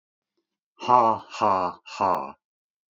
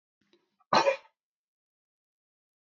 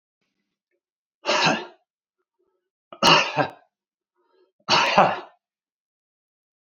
{"exhalation_length": "3.0 s", "exhalation_amplitude": 19762, "exhalation_signal_mean_std_ratio": 0.43, "cough_length": "2.6 s", "cough_amplitude": 11073, "cough_signal_mean_std_ratio": 0.22, "three_cough_length": "6.7 s", "three_cough_amplitude": 27480, "three_cough_signal_mean_std_ratio": 0.33, "survey_phase": "beta (2021-08-13 to 2022-03-07)", "age": "65+", "gender": "Male", "wearing_mask": "No", "symptom_none": true, "smoker_status": "Ex-smoker", "respiratory_condition_asthma": false, "respiratory_condition_other": false, "recruitment_source": "REACT", "submission_delay": "1 day", "covid_test_result": "Negative", "covid_test_method": "RT-qPCR", "influenza_a_test_result": "Negative", "influenza_b_test_result": "Negative"}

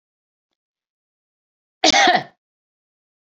{"cough_length": "3.3 s", "cough_amplitude": 31112, "cough_signal_mean_std_ratio": 0.26, "survey_phase": "beta (2021-08-13 to 2022-03-07)", "age": "45-64", "gender": "Female", "wearing_mask": "No", "symptom_none": true, "smoker_status": "Never smoked", "respiratory_condition_asthma": false, "respiratory_condition_other": false, "recruitment_source": "REACT", "submission_delay": "1 day", "covid_test_result": "Negative", "covid_test_method": "RT-qPCR"}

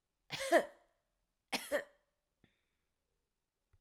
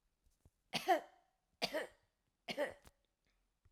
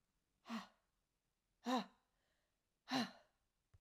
{"cough_length": "3.8 s", "cough_amplitude": 5278, "cough_signal_mean_std_ratio": 0.25, "three_cough_length": "3.7 s", "three_cough_amplitude": 3012, "three_cough_signal_mean_std_ratio": 0.3, "exhalation_length": "3.8 s", "exhalation_amplitude": 1630, "exhalation_signal_mean_std_ratio": 0.3, "survey_phase": "alpha (2021-03-01 to 2021-08-12)", "age": "65+", "gender": "Female", "wearing_mask": "No", "symptom_none": true, "smoker_status": "Ex-smoker", "respiratory_condition_asthma": true, "respiratory_condition_other": false, "recruitment_source": "REACT", "submission_delay": "5 days", "covid_test_result": "Negative", "covid_test_method": "RT-qPCR"}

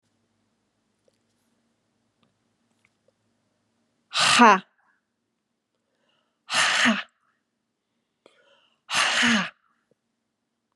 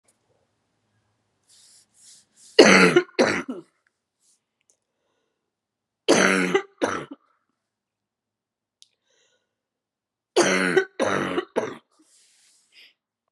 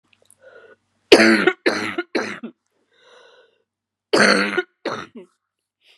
{"exhalation_length": "10.8 s", "exhalation_amplitude": 28349, "exhalation_signal_mean_std_ratio": 0.28, "three_cough_length": "13.3 s", "three_cough_amplitude": 32570, "three_cough_signal_mean_std_ratio": 0.3, "cough_length": "6.0 s", "cough_amplitude": 32768, "cough_signal_mean_std_ratio": 0.35, "survey_phase": "beta (2021-08-13 to 2022-03-07)", "age": "45-64", "gender": "Female", "wearing_mask": "No", "symptom_cough_any": true, "symptom_runny_or_blocked_nose": true, "symptom_shortness_of_breath": true, "symptom_fatigue": true, "symptom_headache": true, "symptom_change_to_sense_of_smell_or_taste": true, "symptom_loss_of_taste": true, "symptom_onset": "3 days", "smoker_status": "Never smoked", "respiratory_condition_asthma": false, "respiratory_condition_other": false, "recruitment_source": "Test and Trace", "submission_delay": "2 days", "covid_test_result": "Positive", "covid_test_method": "RT-qPCR", "covid_ct_value": 18.1, "covid_ct_gene": "ORF1ab gene", "covid_ct_mean": 18.9, "covid_viral_load": "640000 copies/ml", "covid_viral_load_category": "Low viral load (10K-1M copies/ml)"}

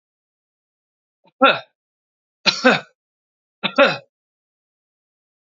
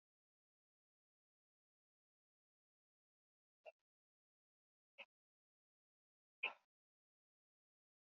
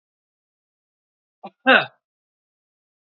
{"three_cough_length": "5.5 s", "three_cough_amplitude": 32352, "three_cough_signal_mean_std_ratio": 0.25, "exhalation_length": "8.0 s", "exhalation_amplitude": 941, "exhalation_signal_mean_std_ratio": 0.09, "cough_length": "3.2 s", "cough_amplitude": 32545, "cough_signal_mean_std_ratio": 0.18, "survey_phase": "beta (2021-08-13 to 2022-03-07)", "age": "45-64", "gender": "Male", "wearing_mask": "No", "symptom_none": true, "smoker_status": "Never smoked", "respiratory_condition_asthma": false, "respiratory_condition_other": false, "recruitment_source": "REACT", "submission_delay": "2 days", "covid_test_result": "Negative", "covid_test_method": "RT-qPCR"}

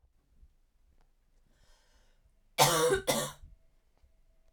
{"cough_length": "4.5 s", "cough_amplitude": 10503, "cough_signal_mean_std_ratio": 0.31, "survey_phase": "beta (2021-08-13 to 2022-03-07)", "age": "18-44", "gender": "Female", "wearing_mask": "No", "symptom_cough_any": true, "symptom_runny_or_blocked_nose": true, "symptom_shortness_of_breath": true, "symptom_fatigue": true, "symptom_headache": true, "symptom_onset": "4 days", "smoker_status": "Never smoked", "respiratory_condition_asthma": false, "respiratory_condition_other": false, "recruitment_source": "Test and Trace", "submission_delay": "2 days", "covid_test_result": "Positive", "covid_test_method": "RT-qPCR", "covid_ct_value": 19.6, "covid_ct_gene": "N gene", "covid_ct_mean": 20.2, "covid_viral_load": "240000 copies/ml", "covid_viral_load_category": "Low viral load (10K-1M copies/ml)"}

